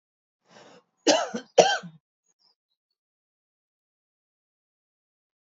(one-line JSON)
{"cough_length": "5.5 s", "cough_amplitude": 32173, "cough_signal_mean_std_ratio": 0.2, "survey_phase": "beta (2021-08-13 to 2022-03-07)", "age": "45-64", "gender": "Female", "wearing_mask": "No", "symptom_cough_any": true, "symptom_runny_or_blocked_nose": true, "symptom_fatigue": true, "symptom_onset": "3 days", "smoker_status": "Never smoked", "respiratory_condition_asthma": false, "respiratory_condition_other": false, "recruitment_source": "Test and Trace", "submission_delay": "2 days", "covid_test_result": "Positive", "covid_test_method": "RT-qPCR", "covid_ct_value": 24.3, "covid_ct_gene": "ORF1ab gene"}